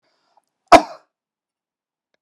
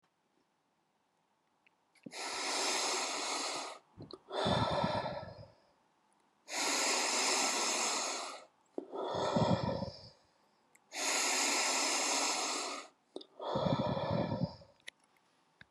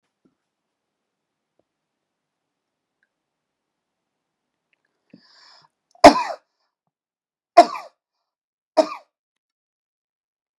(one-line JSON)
{"cough_length": "2.2 s", "cough_amplitude": 32768, "cough_signal_mean_std_ratio": 0.16, "exhalation_length": "15.7 s", "exhalation_amplitude": 3909, "exhalation_signal_mean_std_ratio": 0.68, "three_cough_length": "10.6 s", "three_cough_amplitude": 32768, "three_cough_signal_mean_std_ratio": 0.13, "survey_phase": "beta (2021-08-13 to 2022-03-07)", "age": "45-64", "gender": "Male", "wearing_mask": "No", "symptom_none": true, "smoker_status": "Never smoked", "respiratory_condition_asthma": false, "respiratory_condition_other": false, "recruitment_source": "REACT", "submission_delay": "2 days", "covid_test_result": "Negative", "covid_test_method": "RT-qPCR", "influenza_a_test_result": "Negative", "influenza_b_test_result": "Negative"}